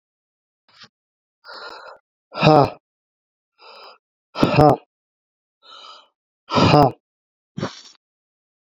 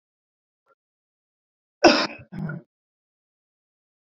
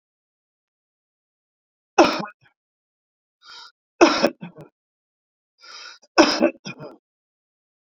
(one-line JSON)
{"exhalation_length": "8.7 s", "exhalation_amplitude": 32768, "exhalation_signal_mean_std_ratio": 0.28, "cough_length": "4.1 s", "cough_amplitude": 28471, "cough_signal_mean_std_ratio": 0.2, "three_cough_length": "7.9 s", "three_cough_amplitude": 32767, "three_cough_signal_mean_std_ratio": 0.24, "survey_phase": "beta (2021-08-13 to 2022-03-07)", "age": "45-64", "gender": "Male", "wearing_mask": "No", "symptom_none": true, "symptom_onset": "11 days", "smoker_status": "Ex-smoker", "respiratory_condition_asthma": true, "respiratory_condition_other": true, "recruitment_source": "REACT", "submission_delay": "1 day", "covid_test_result": "Negative", "covid_test_method": "RT-qPCR"}